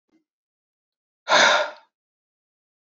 {"exhalation_length": "2.9 s", "exhalation_amplitude": 20225, "exhalation_signal_mean_std_ratio": 0.29, "survey_phase": "beta (2021-08-13 to 2022-03-07)", "age": "45-64", "gender": "Male", "wearing_mask": "No", "symptom_cough_any": true, "symptom_runny_or_blocked_nose": true, "symptom_sore_throat": true, "symptom_fatigue": true, "symptom_headache": true, "symptom_change_to_sense_of_smell_or_taste": true, "smoker_status": "Ex-smoker", "respiratory_condition_asthma": false, "respiratory_condition_other": false, "recruitment_source": "Test and Trace", "submission_delay": "2 days", "covid_test_result": "Positive", "covid_test_method": "RT-qPCR"}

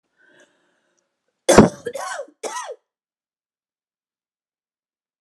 {"cough_length": "5.2 s", "cough_amplitude": 32768, "cough_signal_mean_std_ratio": 0.2, "survey_phase": "alpha (2021-03-01 to 2021-08-12)", "age": "45-64", "gender": "Female", "wearing_mask": "No", "symptom_none": true, "smoker_status": "Never smoked", "respiratory_condition_asthma": false, "respiratory_condition_other": false, "recruitment_source": "REACT", "submission_delay": "3 days", "covid_test_result": "Negative", "covid_test_method": "RT-qPCR"}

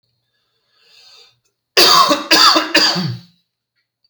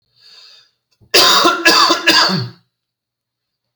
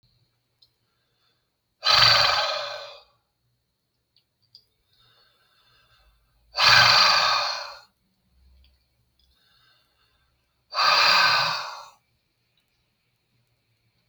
{"three_cough_length": "4.1 s", "three_cough_amplitude": 32768, "three_cough_signal_mean_std_ratio": 0.45, "cough_length": "3.8 s", "cough_amplitude": 32768, "cough_signal_mean_std_ratio": 0.49, "exhalation_length": "14.1 s", "exhalation_amplitude": 25760, "exhalation_signal_mean_std_ratio": 0.36, "survey_phase": "beta (2021-08-13 to 2022-03-07)", "age": "45-64", "gender": "Male", "wearing_mask": "No", "symptom_none": true, "smoker_status": "Ex-smoker", "respiratory_condition_asthma": false, "respiratory_condition_other": false, "recruitment_source": "REACT", "submission_delay": "6 days", "covid_test_result": "Negative", "covid_test_method": "RT-qPCR", "influenza_a_test_result": "Negative", "influenza_b_test_result": "Negative"}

